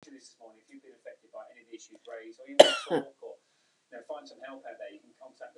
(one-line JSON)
{"cough_length": "5.6 s", "cough_amplitude": 32024, "cough_signal_mean_std_ratio": 0.2, "survey_phase": "beta (2021-08-13 to 2022-03-07)", "age": "45-64", "gender": "Female", "wearing_mask": "No", "symptom_none": true, "smoker_status": "Never smoked", "respiratory_condition_asthma": false, "respiratory_condition_other": false, "recruitment_source": "REACT", "submission_delay": "2 days", "covid_test_result": "Negative", "covid_test_method": "RT-qPCR"}